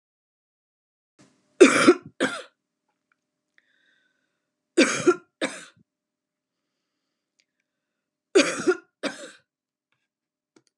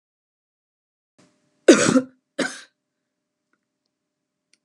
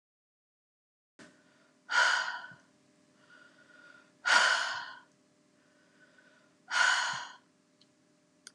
{"three_cough_length": "10.8 s", "three_cough_amplitude": 28862, "three_cough_signal_mean_std_ratio": 0.24, "cough_length": "4.6 s", "cough_amplitude": 31594, "cough_signal_mean_std_ratio": 0.21, "exhalation_length": "8.5 s", "exhalation_amplitude": 8737, "exhalation_signal_mean_std_ratio": 0.35, "survey_phase": "alpha (2021-03-01 to 2021-08-12)", "age": "65+", "gender": "Female", "wearing_mask": "No", "symptom_none": true, "symptom_onset": "4 days", "smoker_status": "Never smoked", "respiratory_condition_asthma": false, "respiratory_condition_other": false, "recruitment_source": "REACT", "submission_delay": "2 days", "covid_test_result": "Negative", "covid_test_method": "RT-qPCR"}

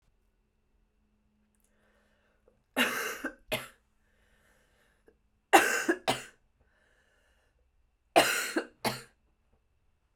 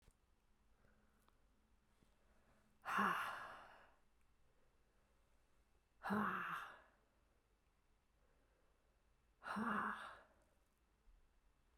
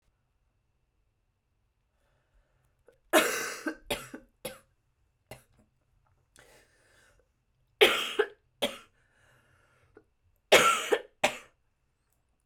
{"three_cough_length": "10.2 s", "three_cough_amplitude": 20377, "three_cough_signal_mean_std_ratio": 0.27, "exhalation_length": "11.8 s", "exhalation_amplitude": 1521, "exhalation_signal_mean_std_ratio": 0.36, "cough_length": "12.5 s", "cough_amplitude": 21931, "cough_signal_mean_std_ratio": 0.25, "survey_phase": "beta (2021-08-13 to 2022-03-07)", "age": "18-44", "gender": "Female", "wearing_mask": "No", "symptom_cough_any": true, "symptom_runny_or_blocked_nose": true, "symptom_sore_throat": true, "symptom_abdominal_pain": true, "symptom_diarrhoea": true, "symptom_fatigue": true, "symptom_fever_high_temperature": true, "symptom_headache": true, "smoker_status": "Ex-smoker", "respiratory_condition_asthma": false, "respiratory_condition_other": false, "recruitment_source": "Test and Trace", "submission_delay": "2 days", "covid_test_result": "Positive", "covid_test_method": "RT-qPCR", "covid_ct_value": 28.8, "covid_ct_gene": "ORF1ab gene", "covid_ct_mean": 29.4, "covid_viral_load": "230 copies/ml", "covid_viral_load_category": "Minimal viral load (< 10K copies/ml)"}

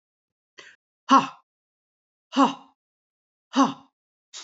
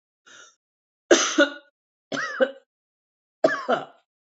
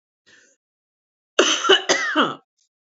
{"exhalation_length": "4.4 s", "exhalation_amplitude": 20072, "exhalation_signal_mean_std_ratio": 0.25, "three_cough_length": "4.3 s", "three_cough_amplitude": 25895, "three_cough_signal_mean_std_ratio": 0.33, "cough_length": "2.8 s", "cough_amplitude": 27638, "cough_signal_mean_std_ratio": 0.41, "survey_phase": "beta (2021-08-13 to 2022-03-07)", "age": "65+", "gender": "Female", "wearing_mask": "No", "symptom_runny_or_blocked_nose": true, "symptom_onset": "7 days", "smoker_status": "Never smoked", "respiratory_condition_asthma": false, "respiratory_condition_other": false, "recruitment_source": "REACT", "submission_delay": "3 days", "covid_test_result": "Negative", "covid_test_method": "RT-qPCR", "influenza_a_test_result": "Negative", "influenza_b_test_result": "Negative"}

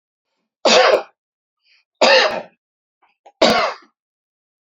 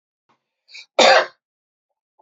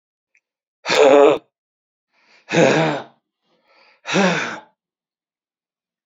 {"three_cough_length": "4.6 s", "three_cough_amplitude": 30342, "three_cough_signal_mean_std_ratio": 0.38, "cough_length": "2.2 s", "cough_amplitude": 28675, "cough_signal_mean_std_ratio": 0.28, "exhalation_length": "6.1 s", "exhalation_amplitude": 29309, "exhalation_signal_mean_std_ratio": 0.37, "survey_phase": "beta (2021-08-13 to 2022-03-07)", "age": "45-64", "gender": "Male", "wearing_mask": "No", "symptom_none": true, "smoker_status": "Never smoked", "respiratory_condition_asthma": false, "respiratory_condition_other": false, "recruitment_source": "REACT", "submission_delay": "1 day", "covid_test_result": "Negative", "covid_test_method": "RT-qPCR"}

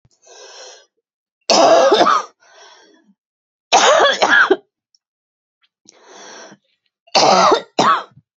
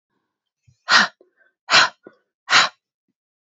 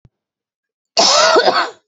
{"three_cough_length": "8.4 s", "three_cough_amplitude": 32768, "three_cough_signal_mean_std_ratio": 0.45, "exhalation_length": "3.4 s", "exhalation_amplitude": 32194, "exhalation_signal_mean_std_ratio": 0.31, "cough_length": "1.9 s", "cough_amplitude": 31394, "cough_signal_mean_std_ratio": 0.53, "survey_phase": "beta (2021-08-13 to 2022-03-07)", "age": "45-64", "gender": "Female", "wearing_mask": "No", "symptom_runny_or_blocked_nose": true, "symptom_abdominal_pain": true, "symptom_fatigue": true, "symptom_headache": true, "smoker_status": "Ex-smoker", "respiratory_condition_asthma": true, "respiratory_condition_other": false, "recruitment_source": "REACT", "submission_delay": "1 day", "covid_test_result": "Negative", "covid_test_method": "RT-qPCR", "influenza_a_test_result": "Negative", "influenza_b_test_result": "Negative"}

